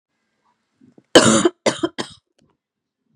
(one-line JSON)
{"cough_length": "3.2 s", "cough_amplitude": 32768, "cough_signal_mean_std_ratio": 0.29, "survey_phase": "beta (2021-08-13 to 2022-03-07)", "age": "18-44", "gender": "Female", "wearing_mask": "No", "symptom_cough_any": true, "symptom_fever_high_temperature": true, "symptom_headache": true, "smoker_status": "Never smoked", "respiratory_condition_asthma": false, "respiratory_condition_other": false, "recruitment_source": "Test and Trace", "submission_delay": "1 day", "covid_test_result": "Positive", "covid_test_method": "RT-qPCR"}